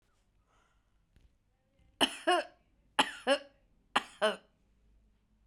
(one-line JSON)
{"three_cough_length": "5.5 s", "three_cough_amplitude": 8232, "three_cough_signal_mean_std_ratio": 0.28, "survey_phase": "beta (2021-08-13 to 2022-03-07)", "age": "45-64", "gender": "Female", "wearing_mask": "No", "symptom_none": true, "smoker_status": "Ex-smoker", "respiratory_condition_asthma": false, "respiratory_condition_other": false, "recruitment_source": "REACT", "submission_delay": "1 day", "covid_test_result": "Negative", "covid_test_method": "RT-qPCR"}